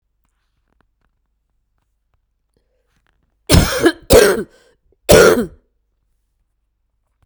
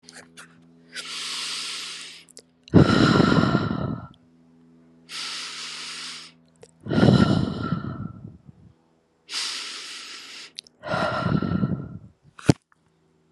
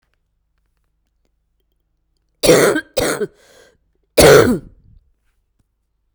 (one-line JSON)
{"three_cough_length": "7.3 s", "three_cough_amplitude": 32768, "three_cough_signal_mean_std_ratio": 0.29, "exhalation_length": "13.3 s", "exhalation_amplitude": 32575, "exhalation_signal_mean_std_ratio": 0.45, "cough_length": "6.1 s", "cough_amplitude": 32768, "cough_signal_mean_std_ratio": 0.31, "survey_phase": "beta (2021-08-13 to 2022-03-07)", "age": "45-64", "gender": "Female", "wearing_mask": "No", "symptom_cough_any": true, "symptom_runny_or_blocked_nose": true, "symptom_loss_of_taste": true, "symptom_onset": "4 days", "smoker_status": "Current smoker (1 to 10 cigarettes per day)", "respiratory_condition_asthma": false, "respiratory_condition_other": false, "recruitment_source": "Test and Trace", "submission_delay": "2 days", "covid_test_result": "Positive", "covid_test_method": "RT-qPCR", "covid_ct_value": 16.5, "covid_ct_gene": "ORF1ab gene", "covid_ct_mean": 17.4, "covid_viral_load": "2000000 copies/ml", "covid_viral_load_category": "High viral load (>1M copies/ml)"}